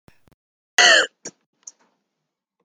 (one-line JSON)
{"cough_length": "2.6 s", "cough_amplitude": 32353, "cough_signal_mean_std_ratio": 0.27, "survey_phase": "beta (2021-08-13 to 2022-03-07)", "age": "45-64", "gender": "Female", "wearing_mask": "No", "symptom_none": true, "smoker_status": "Never smoked", "respiratory_condition_asthma": false, "respiratory_condition_other": false, "recruitment_source": "REACT", "submission_delay": "2 days", "covid_test_result": "Negative", "covid_test_method": "RT-qPCR"}